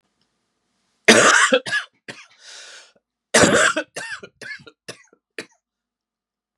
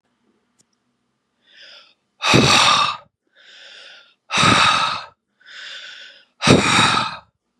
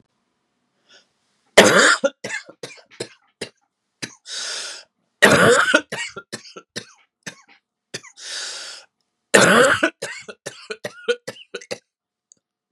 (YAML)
cough_length: 6.6 s
cough_amplitude: 32768
cough_signal_mean_std_ratio: 0.34
exhalation_length: 7.6 s
exhalation_amplitude: 32768
exhalation_signal_mean_std_ratio: 0.45
three_cough_length: 12.7 s
three_cough_amplitude: 32768
three_cough_signal_mean_std_ratio: 0.34
survey_phase: beta (2021-08-13 to 2022-03-07)
age: 18-44
gender: Male
wearing_mask: 'No'
symptom_cough_any: true
symptom_new_continuous_cough: true
symptom_runny_or_blocked_nose: true
symptom_sore_throat: true
symptom_headache: true
symptom_other: true
symptom_onset: 3 days
smoker_status: Never smoked
respiratory_condition_asthma: false
respiratory_condition_other: false
recruitment_source: Test and Trace
submission_delay: 1 day
covid_test_result: Positive
covid_test_method: RT-qPCR
covid_ct_value: 26.6
covid_ct_gene: ORF1ab gene
covid_ct_mean: 26.9
covid_viral_load: 1500 copies/ml
covid_viral_load_category: Minimal viral load (< 10K copies/ml)